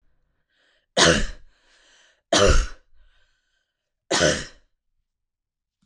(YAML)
three_cough_length: 5.9 s
three_cough_amplitude: 25055
three_cough_signal_mean_std_ratio: 0.33
survey_phase: beta (2021-08-13 to 2022-03-07)
age: 18-44
gender: Female
wearing_mask: 'No'
symptom_none: true
smoker_status: Never smoked
respiratory_condition_asthma: false
respiratory_condition_other: false
recruitment_source: REACT
submission_delay: 5 days
covid_test_result: Negative
covid_test_method: RT-qPCR